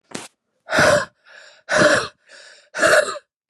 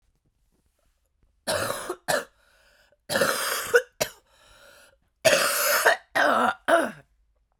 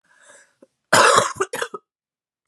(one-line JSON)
{"exhalation_length": "3.5 s", "exhalation_amplitude": 28811, "exhalation_signal_mean_std_ratio": 0.47, "three_cough_length": "7.6 s", "three_cough_amplitude": 19256, "three_cough_signal_mean_std_ratio": 0.46, "cough_length": "2.5 s", "cough_amplitude": 32614, "cough_signal_mean_std_ratio": 0.36, "survey_phase": "beta (2021-08-13 to 2022-03-07)", "age": "18-44", "gender": "Female", "wearing_mask": "No", "symptom_shortness_of_breath": true, "symptom_sore_throat": true, "symptom_fatigue": true, "symptom_fever_high_temperature": true, "symptom_headache": true, "symptom_onset": "3 days", "smoker_status": "Ex-smoker", "respiratory_condition_asthma": false, "respiratory_condition_other": false, "recruitment_source": "Test and Trace", "submission_delay": "2 days", "covid_test_result": "Positive", "covid_test_method": "RT-qPCR", "covid_ct_value": 23.7, "covid_ct_gene": "ORF1ab gene", "covid_ct_mean": 26.0, "covid_viral_load": "2900 copies/ml", "covid_viral_load_category": "Minimal viral load (< 10K copies/ml)"}